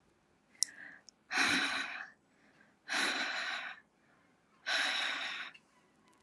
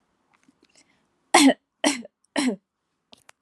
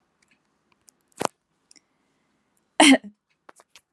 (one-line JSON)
{"exhalation_length": "6.2 s", "exhalation_amplitude": 15480, "exhalation_signal_mean_std_ratio": 0.53, "three_cough_length": "3.4 s", "three_cough_amplitude": 26980, "three_cough_signal_mean_std_ratio": 0.29, "cough_length": "3.9 s", "cough_amplitude": 28299, "cough_signal_mean_std_ratio": 0.19, "survey_phase": "beta (2021-08-13 to 2022-03-07)", "age": "18-44", "gender": "Female", "wearing_mask": "No", "symptom_none": true, "smoker_status": "Never smoked", "respiratory_condition_asthma": false, "respiratory_condition_other": false, "recruitment_source": "REACT", "submission_delay": "1 day", "covid_test_result": "Negative", "covid_test_method": "RT-qPCR", "influenza_a_test_result": "Unknown/Void", "influenza_b_test_result": "Unknown/Void"}